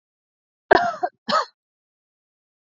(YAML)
cough_length: 2.7 s
cough_amplitude: 28383
cough_signal_mean_std_ratio: 0.27
survey_phase: beta (2021-08-13 to 2022-03-07)
age: 45-64
gender: Female
wearing_mask: 'No'
symptom_none: true
smoker_status: Ex-smoker
respiratory_condition_asthma: false
respiratory_condition_other: false
recruitment_source: REACT
submission_delay: 1 day
covid_test_result: Negative
covid_test_method: RT-qPCR
influenza_a_test_result: Negative
influenza_b_test_result: Negative